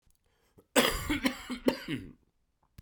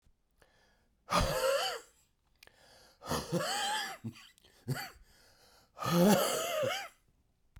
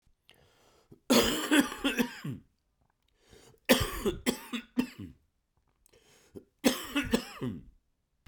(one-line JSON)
{"cough_length": "2.8 s", "cough_amplitude": 12128, "cough_signal_mean_std_ratio": 0.41, "exhalation_length": "7.6 s", "exhalation_amplitude": 6804, "exhalation_signal_mean_std_ratio": 0.5, "three_cough_length": "8.3 s", "three_cough_amplitude": 15105, "three_cough_signal_mean_std_ratio": 0.39, "survey_phase": "beta (2021-08-13 to 2022-03-07)", "age": "45-64", "gender": "Male", "wearing_mask": "No", "symptom_cough_any": true, "symptom_sore_throat": true, "symptom_fatigue": true, "symptom_headache": true, "symptom_change_to_sense_of_smell_or_taste": true, "symptom_onset": "4 days", "smoker_status": "Never smoked", "respiratory_condition_asthma": false, "respiratory_condition_other": false, "recruitment_source": "Test and Trace", "submission_delay": "1 day", "covid_test_result": "Positive", "covid_test_method": "RT-qPCR", "covid_ct_value": 12.0, "covid_ct_gene": "ORF1ab gene", "covid_ct_mean": 12.3, "covid_viral_load": "90000000 copies/ml", "covid_viral_load_category": "High viral load (>1M copies/ml)"}